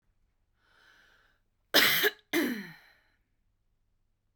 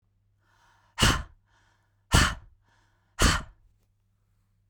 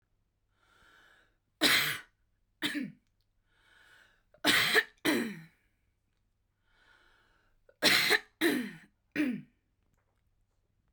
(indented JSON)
{
  "cough_length": "4.4 s",
  "cough_amplitude": 13383,
  "cough_signal_mean_std_ratio": 0.31,
  "exhalation_length": "4.7 s",
  "exhalation_amplitude": 17817,
  "exhalation_signal_mean_std_ratio": 0.29,
  "three_cough_length": "10.9 s",
  "three_cough_amplitude": 9191,
  "three_cough_signal_mean_std_ratio": 0.35,
  "survey_phase": "beta (2021-08-13 to 2022-03-07)",
  "age": "18-44",
  "gender": "Female",
  "wearing_mask": "No",
  "symptom_cough_any": true,
  "smoker_status": "Never smoked",
  "respiratory_condition_asthma": false,
  "respiratory_condition_other": false,
  "recruitment_source": "REACT",
  "submission_delay": "1 day",
  "covid_test_result": "Negative",
  "covid_test_method": "RT-qPCR",
  "influenza_a_test_result": "Negative",
  "influenza_b_test_result": "Negative"
}